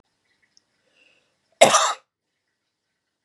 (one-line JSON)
{"cough_length": "3.2 s", "cough_amplitude": 32768, "cough_signal_mean_std_ratio": 0.22, "survey_phase": "beta (2021-08-13 to 2022-03-07)", "age": "18-44", "gender": "Female", "wearing_mask": "No", "symptom_none": true, "smoker_status": "Never smoked", "respiratory_condition_asthma": false, "respiratory_condition_other": false, "recruitment_source": "REACT", "submission_delay": "1 day", "covid_test_result": "Negative", "covid_test_method": "RT-qPCR", "influenza_a_test_result": "Negative", "influenza_b_test_result": "Negative"}